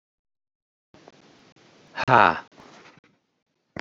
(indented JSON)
{
  "exhalation_length": "3.8 s",
  "exhalation_amplitude": 28050,
  "exhalation_signal_mean_std_ratio": 0.2,
  "survey_phase": "beta (2021-08-13 to 2022-03-07)",
  "age": "45-64",
  "gender": "Male",
  "wearing_mask": "No",
  "symptom_none": true,
  "smoker_status": "Current smoker (1 to 10 cigarettes per day)",
  "respiratory_condition_asthma": false,
  "respiratory_condition_other": false,
  "recruitment_source": "REACT",
  "submission_delay": "6 days",
  "covid_test_result": "Negative",
  "covid_test_method": "RT-qPCR"
}